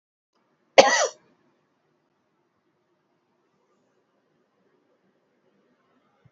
cough_length: 6.3 s
cough_amplitude: 28838
cough_signal_mean_std_ratio: 0.15
survey_phase: beta (2021-08-13 to 2022-03-07)
age: 45-64
gender: Female
wearing_mask: 'No'
symptom_none: true
smoker_status: Ex-smoker
respiratory_condition_asthma: true
respiratory_condition_other: false
recruitment_source: REACT
submission_delay: 2 days
covid_test_result: Negative
covid_test_method: RT-qPCR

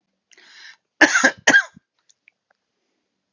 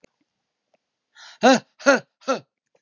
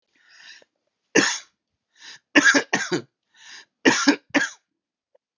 cough_length: 3.3 s
cough_amplitude: 32504
cough_signal_mean_std_ratio: 0.28
exhalation_length: 2.8 s
exhalation_amplitude: 25111
exhalation_signal_mean_std_ratio: 0.3
three_cough_length: 5.4 s
three_cough_amplitude: 30759
three_cough_signal_mean_std_ratio: 0.34
survey_phase: beta (2021-08-13 to 2022-03-07)
age: 65+
gender: Male
wearing_mask: 'No'
symptom_none: true
smoker_status: Never smoked
respiratory_condition_asthma: false
respiratory_condition_other: false
recruitment_source: REACT
submission_delay: 0 days
covid_test_result: Negative
covid_test_method: RT-qPCR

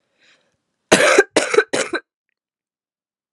three_cough_length: 3.3 s
three_cough_amplitude: 32768
three_cough_signal_mean_std_ratio: 0.34
survey_phase: beta (2021-08-13 to 2022-03-07)
age: 18-44
gender: Female
wearing_mask: 'No'
symptom_cough_any: true
symptom_new_continuous_cough: true
symptom_runny_or_blocked_nose: true
symptom_shortness_of_breath: true
symptom_fatigue: true
symptom_headache: true
symptom_change_to_sense_of_smell_or_taste: true
symptom_onset: 5 days
smoker_status: Never smoked
respiratory_condition_asthma: false
respiratory_condition_other: false
recruitment_source: Test and Trace
submission_delay: 1 day
covid_test_result: Positive
covid_test_method: RT-qPCR
covid_ct_value: 19.8
covid_ct_gene: ORF1ab gene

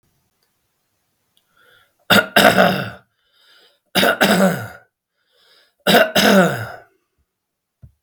three_cough_length: 8.0 s
three_cough_amplitude: 32768
three_cough_signal_mean_std_ratio: 0.4
survey_phase: beta (2021-08-13 to 2022-03-07)
age: 45-64
gender: Male
wearing_mask: 'No'
symptom_none: true
smoker_status: Ex-smoker
respiratory_condition_asthma: true
respiratory_condition_other: false
recruitment_source: REACT
submission_delay: 13 days
covid_test_result: Negative
covid_test_method: RT-qPCR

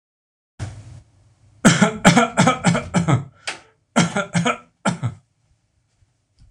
three_cough_length: 6.5 s
three_cough_amplitude: 26028
three_cough_signal_mean_std_ratio: 0.43
survey_phase: alpha (2021-03-01 to 2021-08-12)
age: 65+
gender: Male
wearing_mask: 'No'
symptom_none: true
smoker_status: Ex-smoker
respiratory_condition_asthma: false
respiratory_condition_other: false
recruitment_source: REACT
submission_delay: 1 day
covid_test_result: Negative
covid_test_method: RT-qPCR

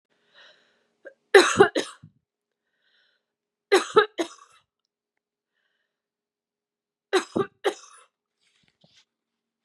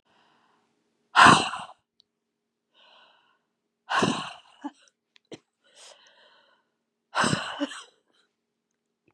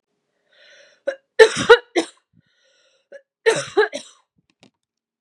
three_cough_length: 9.6 s
three_cough_amplitude: 28547
three_cough_signal_mean_std_ratio: 0.22
exhalation_length: 9.1 s
exhalation_amplitude: 27090
exhalation_signal_mean_std_ratio: 0.24
cough_length: 5.2 s
cough_amplitude: 32768
cough_signal_mean_std_ratio: 0.25
survey_phase: beta (2021-08-13 to 2022-03-07)
age: 18-44
gender: Female
wearing_mask: 'No'
symptom_runny_or_blocked_nose: true
symptom_fatigue: true
symptom_onset: 8 days
smoker_status: Never smoked
respiratory_condition_asthma: false
respiratory_condition_other: false
recruitment_source: Test and Trace
submission_delay: 2 days
covid_test_result: Positive
covid_test_method: LAMP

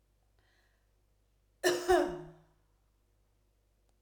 cough_length: 4.0 s
cough_amplitude: 6258
cough_signal_mean_std_ratio: 0.28
survey_phase: alpha (2021-03-01 to 2021-08-12)
age: 45-64
gender: Female
wearing_mask: 'No'
symptom_none: true
smoker_status: Never smoked
respiratory_condition_asthma: false
respiratory_condition_other: false
recruitment_source: REACT
submission_delay: 2 days
covid_test_result: Negative
covid_test_method: RT-qPCR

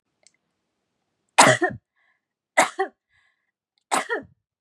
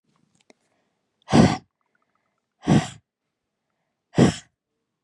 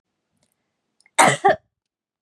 three_cough_length: 4.6 s
three_cough_amplitude: 32328
three_cough_signal_mean_std_ratio: 0.27
exhalation_length: 5.0 s
exhalation_amplitude: 30017
exhalation_signal_mean_std_ratio: 0.26
cough_length: 2.2 s
cough_amplitude: 32702
cough_signal_mean_std_ratio: 0.28
survey_phase: beta (2021-08-13 to 2022-03-07)
age: 18-44
gender: Female
wearing_mask: 'No'
symptom_none: true
smoker_status: Never smoked
respiratory_condition_asthma: false
respiratory_condition_other: false
recruitment_source: REACT
submission_delay: 1 day
covid_test_result: Negative
covid_test_method: RT-qPCR
influenza_a_test_result: Negative
influenza_b_test_result: Negative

